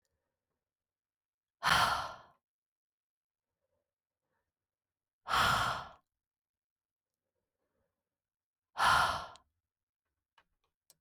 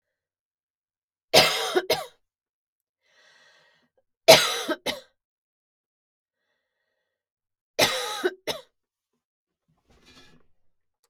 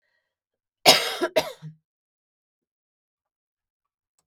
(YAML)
exhalation_length: 11.0 s
exhalation_amplitude: 5480
exhalation_signal_mean_std_ratio: 0.28
three_cough_length: 11.1 s
three_cough_amplitude: 32768
three_cough_signal_mean_std_ratio: 0.24
cough_length: 4.3 s
cough_amplitude: 32767
cough_signal_mean_std_ratio: 0.22
survey_phase: beta (2021-08-13 to 2022-03-07)
age: 45-64
gender: Female
wearing_mask: 'No'
symptom_none: true
smoker_status: Never smoked
respiratory_condition_asthma: false
respiratory_condition_other: false
recruitment_source: Test and Trace
submission_delay: 0 days
covid_test_result: Negative
covid_test_method: LFT